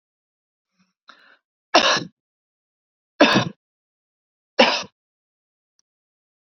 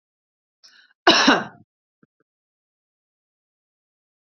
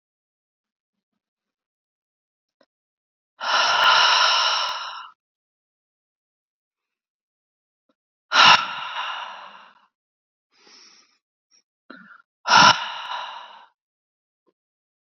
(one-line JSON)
{"three_cough_length": "6.6 s", "three_cough_amplitude": 29318, "three_cough_signal_mean_std_ratio": 0.25, "cough_length": "4.3 s", "cough_amplitude": 28421, "cough_signal_mean_std_ratio": 0.22, "exhalation_length": "15.0 s", "exhalation_amplitude": 28618, "exhalation_signal_mean_std_ratio": 0.31, "survey_phase": "beta (2021-08-13 to 2022-03-07)", "age": "45-64", "gender": "Female", "wearing_mask": "No", "symptom_none": true, "smoker_status": "Never smoked", "respiratory_condition_asthma": false, "respiratory_condition_other": false, "recruitment_source": "REACT", "submission_delay": "1 day", "covid_test_result": "Negative", "covid_test_method": "RT-qPCR", "influenza_a_test_result": "Negative", "influenza_b_test_result": "Negative"}